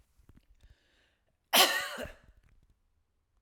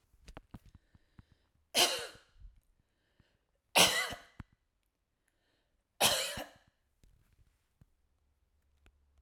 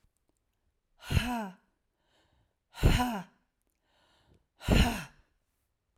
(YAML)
cough_length: 3.4 s
cough_amplitude: 14876
cough_signal_mean_std_ratio: 0.26
three_cough_length: 9.2 s
three_cough_amplitude: 14423
three_cough_signal_mean_std_ratio: 0.25
exhalation_length: 6.0 s
exhalation_amplitude: 10934
exhalation_signal_mean_std_ratio: 0.32
survey_phase: alpha (2021-03-01 to 2021-08-12)
age: 45-64
gender: Female
wearing_mask: 'No'
symptom_none: true
smoker_status: Ex-smoker
respiratory_condition_asthma: false
respiratory_condition_other: false
recruitment_source: REACT
submission_delay: 1 day
covid_test_result: Negative
covid_test_method: RT-qPCR